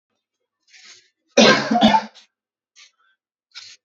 {"cough_length": "3.8 s", "cough_amplitude": 29463, "cough_signal_mean_std_ratio": 0.32, "survey_phase": "beta (2021-08-13 to 2022-03-07)", "age": "18-44", "gender": "Male", "wearing_mask": "No", "symptom_none": true, "smoker_status": "Ex-smoker", "respiratory_condition_asthma": false, "respiratory_condition_other": false, "recruitment_source": "REACT", "submission_delay": "11 days", "covid_test_result": "Negative", "covid_test_method": "RT-qPCR"}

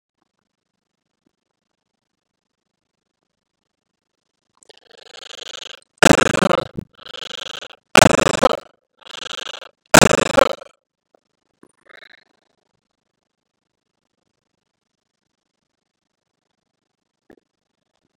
{"cough_length": "18.2 s", "cough_amplitude": 32768, "cough_signal_mean_std_ratio": 0.18, "survey_phase": "beta (2021-08-13 to 2022-03-07)", "age": "65+", "gender": "Male", "wearing_mask": "No", "symptom_runny_or_blocked_nose": true, "smoker_status": "Ex-smoker", "respiratory_condition_asthma": false, "respiratory_condition_other": false, "recruitment_source": "REACT", "submission_delay": "2 days", "covid_test_result": "Negative", "covid_test_method": "RT-qPCR", "influenza_a_test_result": "Negative", "influenza_b_test_result": "Negative"}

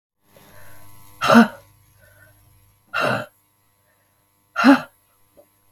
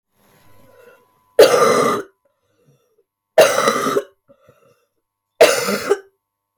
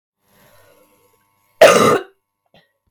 {"exhalation_length": "5.7 s", "exhalation_amplitude": 32706, "exhalation_signal_mean_std_ratio": 0.28, "three_cough_length": "6.6 s", "three_cough_amplitude": 32768, "three_cough_signal_mean_std_ratio": 0.39, "cough_length": "2.9 s", "cough_amplitude": 32768, "cough_signal_mean_std_ratio": 0.29, "survey_phase": "beta (2021-08-13 to 2022-03-07)", "age": "18-44", "gender": "Female", "wearing_mask": "No", "symptom_cough_any": true, "symptom_runny_or_blocked_nose": true, "symptom_shortness_of_breath": true, "symptom_onset": "5 days", "smoker_status": "Never smoked", "respiratory_condition_asthma": true, "respiratory_condition_other": false, "recruitment_source": "Test and Trace", "submission_delay": "1 day", "covid_test_result": "Negative", "covid_test_method": "RT-qPCR"}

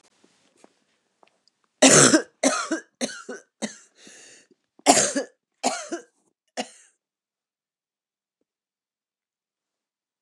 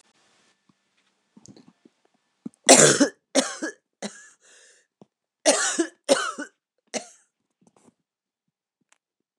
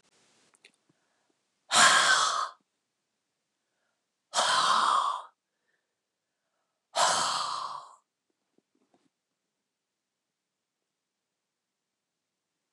{"cough_length": "10.2 s", "cough_amplitude": 29203, "cough_signal_mean_std_ratio": 0.26, "three_cough_length": "9.4 s", "three_cough_amplitude": 29203, "three_cough_signal_mean_std_ratio": 0.26, "exhalation_length": "12.7 s", "exhalation_amplitude": 13322, "exhalation_signal_mean_std_ratio": 0.33, "survey_phase": "beta (2021-08-13 to 2022-03-07)", "age": "45-64", "gender": "Female", "wearing_mask": "No", "symptom_cough_any": true, "symptom_runny_or_blocked_nose": true, "symptom_fatigue": true, "symptom_onset": "6 days", "smoker_status": "Ex-smoker", "respiratory_condition_asthma": false, "respiratory_condition_other": false, "recruitment_source": "Test and Trace", "submission_delay": "2 days", "covid_test_result": "Positive", "covid_test_method": "ePCR"}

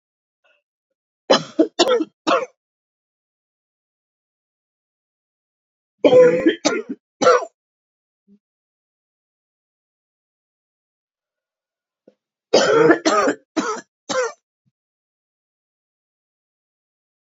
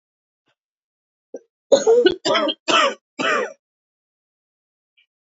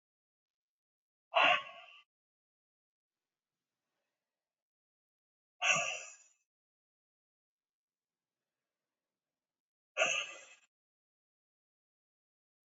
{"three_cough_length": "17.3 s", "three_cough_amplitude": 30783, "three_cough_signal_mean_std_ratio": 0.29, "cough_length": "5.2 s", "cough_amplitude": 26827, "cough_signal_mean_std_ratio": 0.38, "exhalation_length": "12.8 s", "exhalation_amplitude": 5521, "exhalation_signal_mean_std_ratio": 0.21, "survey_phase": "beta (2021-08-13 to 2022-03-07)", "age": "45-64", "gender": "Female", "wearing_mask": "No", "symptom_cough_any": true, "symptom_runny_or_blocked_nose": true, "symptom_shortness_of_breath": true, "symptom_sore_throat": true, "symptom_change_to_sense_of_smell_or_taste": true, "symptom_loss_of_taste": true, "symptom_onset": "8 days", "smoker_status": "Current smoker (1 to 10 cigarettes per day)", "respiratory_condition_asthma": false, "respiratory_condition_other": false, "recruitment_source": "REACT", "submission_delay": "2 days", "covid_test_result": "Negative", "covid_test_method": "RT-qPCR", "covid_ct_value": 41.0, "covid_ct_gene": "N gene", "influenza_a_test_result": "Unknown/Void", "influenza_b_test_result": "Unknown/Void"}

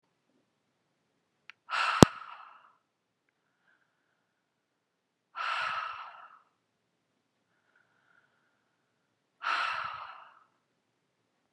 {"exhalation_length": "11.5 s", "exhalation_amplitude": 32768, "exhalation_signal_mean_std_ratio": 0.19, "survey_phase": "beta (2021-08-13 to 2022-03-07)", "age": "45-64", "gender": "Female", "wearing_mask": "No", "symptom_none": true, "smoker_status": "Ex-smoker", "respiratory_condition_asthma": false, "respiratory_condition_other": false, "recruitment_source": "REACT", "submission_delay": "1 day", "covid_test_result": "Negative", "covid_test_method": "RT-qPCR", "influenza_a_test_result": "Negative", "influenza_b_test_result": "Negative"}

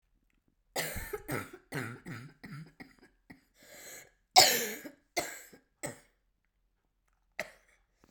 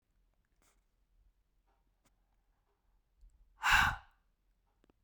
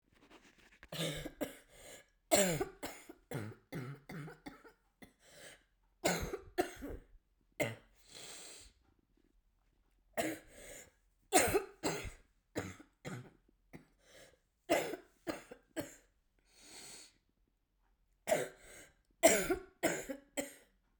{"cough_length": "8.1 s", "cough_amplitude": 18537, "cough_signal_mean_std_ratio": 0.27, "exhalation_length": "5.0 s", "exhalation_amplitude": 6222, "exhalation_signal_mean_std_ratio": 0.21, "three_cough_length": "21.0 s", "three_cough_amplitude": 8608, "three_cough_signal_mean_std_ratio": 0.35, "survey_phase": "beta (2021-08-13 to 2022-03-07)", "age": "18-44", "gender": "Female", "wearing_mask": "No", "symptom_new_continuous_cough": true, "symptom_runny_or_blocked_nose": true, "symptom_sore_throat": true, "symptom_fatigue": true, "symptom_fever_high_temperature": true, "symptom_headache": true, "symptom_change_to_sense_of_smell_or_taste": true, "symptom_loss_of_taste": true, "symptom_onset": "3 days", "smoker_status": "Never smoked", "respiratory_condition_asthma": false, "respiratory_condition_other": false, "recruitment_source": "Test and Trace", "submission_delay": "1 day", "covid_test_result": "Positive", "covid_test_method": "RT-qPCR", "covid_ct_value": 19.1, "covid_ct_gene": "ORF1ab gene", "covid_ct_mean": 19.5, "covid_viral_load": "410000 copies/ml", "covid_viral_load_category": "Low viral load (10K-1M copies/ml)"}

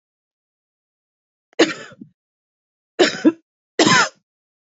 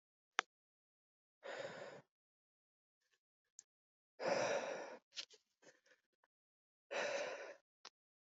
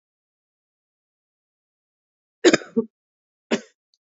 {"three_cough_length": "4.6 s", "three_cough_amplitude": 27788, "three_cough_signal_mean_std_ratio": 0.29, "exhalation_length": "8.3 s", "exhalation_amplitude": 5803, "exhalation_signal_mean_std_ratio": 0.35, "cough_length": "4.1 s", "cough_amplitude": 27702, "cough_signal_mean_std_ratio": 0.18, "survey_phase": "alpha (2021-03-01 to 2021-08-12)", "age": "18-44", "gender": "Female", "wearing_mask": "Yes", "symptom_shortness_of_breath": true, "symptom_fatigue": true, "symptom_change_to_sense_of_smell_or_taste": true, "symptom_loss_of_taste": true, "symptom_onset": "8 days", "smoker_status": "Current smoker (11 or more cigarettes per day)", "respiratory_condition_asthma": false, "respiratory_condition_other": false, "recruitment_source": "Test and Trace", "submission_delay": "4 days", "covid_test_result": "Positive", "covid_test_method": "RT-qPCR"}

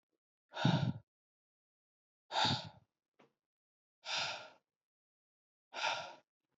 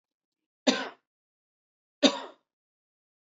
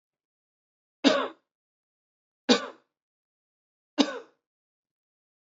{"exhalation_length": "6.6 s", "exhalation_amplitude": 4135, "exhalation_signal_mean_std_ratio": 0.34, "cough_length": "3.3 s", "cough_amplitude": 18312, "cough_signal_mean_std_ratio": 0.21, "three_cough_length": "5.5 s", "three_cough_amplitude": 16857, "three_cough_signal_mean_std_ratio": 0.22, "survey_phase": "beta (2021-08-13 to 2022-03-07)", "age": "18-44", "gender": "Male", "wearing_mask": "No", "symptom_fever_high_temperature": true, "symptom_headache": true, "symptom_change_to_sense_of_smell_or_taste": true, "symptom_loss_of_taste": true, "symptom_onset": "3 days", "smoker_status": "Never smoked", "respiratory_condition_asthma": false, "respiratory_condition_other": false, "recruitment_source": "Test and Trace", "submission_delay": "1 day", "covid_test_result": "Positive", "covid_test_method": "RT-qPCR"}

